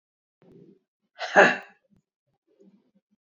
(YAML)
exhalation_length: 3.3 s
exhalation_amplitude: 26172
exhalation_signal_mean_std_ratio: 0.21
survey_phase: beta (2021-08-13 to 2022-03-07)
age: 45-64
gender: Female
wearing_mask: 'No'
symptom_cough_any: true
symptom_runny_or_blocked_nose: true
symptom_sore_throat: true
symptom_abdominal_pain: true
symptom_fatigue: true
symptom_change_to_sense_of_smell_or_taste: true
symptom_loss_of_taste: true
symptom_onset: 3 days
smoker_status: Ex-smoker
respiratory_condition_asthma: false
respiratory_condition_other: false
recruitment_source: Test and Trace
submission_delay: 2 days
covid_test_result: Positive
covid_test_method: ePCR